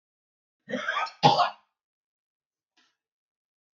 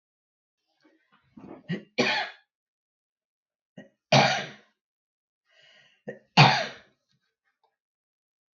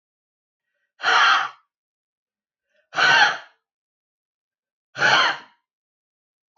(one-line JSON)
{"cough_length": "3.8 s", "cough_amplitude": 19433, "cough_signal_mean_std_ratio": 0.27, "three_cough_length": "8.5 s", "three_cough_amplitude": 25051, "three_cough_signal_mean_std_ratio": 0.25, "exhalation_length": "6.6 s", "exhalation_amplitude": 22540, "exhalation_signal_mean_std_ratio": 0.35, "survey_phase": "beta (2021-08-13 to 2022-03-07)", "age": "45-64", "gender": "Female", "wearing_mask": "No", "symptom_none": true, "smoker_status": "Current smoker (11 or more cigarettes per day)", "respiratory_condition_asthma": true, "respiratory_condition_other": true, "recruitment_source": "REACT", "submission_delay": "4 days", "covid_test_result": "Negative", "covid_test_method": "RT-qPCR", "influenza_a_test_result": "Negative", "influenza_b_test_result": "Negative"}